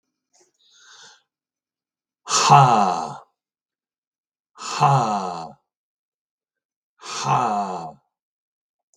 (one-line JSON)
{"exhalation_length": "9.0 s", "exhalation_amplitude": 32768, "exhalation_signal_mean_std_ratio": 0.36, "survey_phase": "beta (2021-08-13 to 2022-03-07)", "age": "65+", "gender": "Male", "wearing_mask": "No", "symptom_none": true, "smoker_status": "Ex-smoker", "respiratory_condition_asthma": false, "respiratory_condition_other": false, "recruitment_source": "REACT", "submission_delay": "3 days", "covid_test_result": "Negative", "covid_test_method": "RT-qPCR", "influenza_a_test_result": "Negative", "influenza_b_test_result": "Negative"}